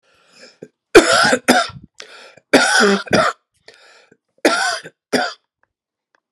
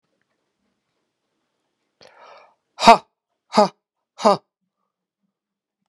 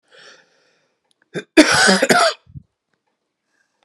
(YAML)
three_cough_length: 6.3 s
three_cough_amplitude: 32768
three_cough_signal_mean_std_ratio: 0.42
exhalation_length: 5.9 s
exhalation_amplitude: 32768
exhalation_signal_mean_std_ratio: 0.18
cough_length: 3.8 s
cough_amplitude: 32768
cough_signal_mean_std_ratio: 0.35
survey_phase: beta (2021-08-13 to 2022-03-07)
age: 45-64
gender: Male
wearing_mask: 'No'
symptom_cough_any: true
symptom_fever_high_temperature: true
smoker_status: Ex-smoker
respiratory_condition_asthma: false
respiratory_condition_other: false
recruitment_source: Test and Trace
submission_delay: 2 days
covid_test_result: Positive
covid_test_method: RT-qPCR